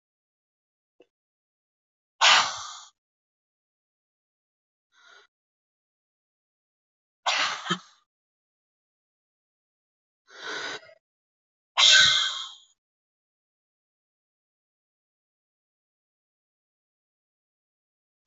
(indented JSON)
{
  "exhalation_length": "18.3 s",
  "exhalation_amplitude": 21670,
  "exhalation_signal_mean_std_ratio": 0.21,
  "survey_phase": "beta (2021-08-13 to 2022-03-07)",
  "age": "18-44",
  "gender": "Female",
  "wearing_mask": "Yes",
  "symptom_runny_or_blocked_nose": true,
  "symptom_fever_high_temperature": true,
  "symptom_headache": true,
  "symptom_change_to_sense_of_smell_or_taste": true,
  "symptom_other": true,
  "symptom_onset": "3 days",
  "smoker_status": "Never smoked",
  "respiratory_condition_asthma": false,
  "respiratory_condition_other": false,
  "recruitment_source": "Test and Trace",
  "submission_delay": "2 days",
  "covid_test_result": "Positive",
  "covid_test_method": "RT-qPCR",
  "covid_ct_value": 16.2,
  "covid_ct_gene": "ORF1ab gene",
  "covid_ct_mean": 16.6,
  "covid_viral_load": "3500000 copies/ml",
  "covid_viral_load_category": "High viral load (>1M copies/ml)"
}